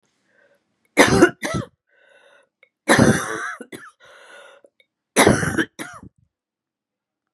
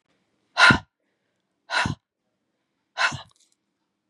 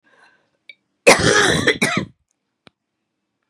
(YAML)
three_cough_length: 7.3 s
three_cough_amplitude: 32767
three_cough_signal_mean_std_ratio: 0.34
exhalation_length: 4.1 s
exhalation_amplitude: 27464
exhalation_signal_mean_std_ratio: 0.26
cough_length: 3.5 s
cough_amplitude: 32768
cough_signal_mean_std_ratio: 0.38
survey_phase: beta (2021-08-13 to 2022-03-07)
age: 45-64
gender: Female
wearing_mask: 'No'
symptom_runny_or_blocked_nose: true
symptom_sore_throat: true
symptom_headache: true
symptom_onset: 4 days
smoker_status: Never smoked
respiratory_condition_asthma: false
respiratory_condition_other: false
recruitment_source: REACT
submission_delay: 1 day
covid_test_result: Negative
covid_test_method: RT-qPCR
influenza_a_test_result: Negative
influenza_b_test_result: Negative